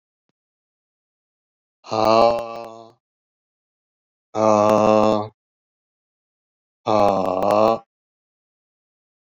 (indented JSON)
{
  "exhalation_length": "9.4 s",
  "exhalation_amplitude": 25364,
  "exhalation_signal_mean_std_ratio": 0.37,
  "survey_phase": "beta (2021-08-13 to 2022-03-07)",
  "age": "65+",
  "gender": "Male",
  "wearing_mask": "No",
  "symptom_cough_any": true,
  "symptom_runny_or_blocked_nose": true,
  "symptom_sore_throat": true,
  "symptom_fatigue": true,
  "symptom_fever_high_temperature": true,
  "symptom_headache": true,
  "symptom_change_to_sense_of_smell_or_taste": true,
  "symptom_onset": "2 days",
  "smoker_status": "Ex-smoker",
  "respiratory_condition_asthma": false,
  "respiratory_condition_other": false,
  "recruitment_source": "Test and Trace",
  "submission_delay": "1 day",
  "covid_test_result": "Positive",
  "covid_test_method": "RT-qPCR"
}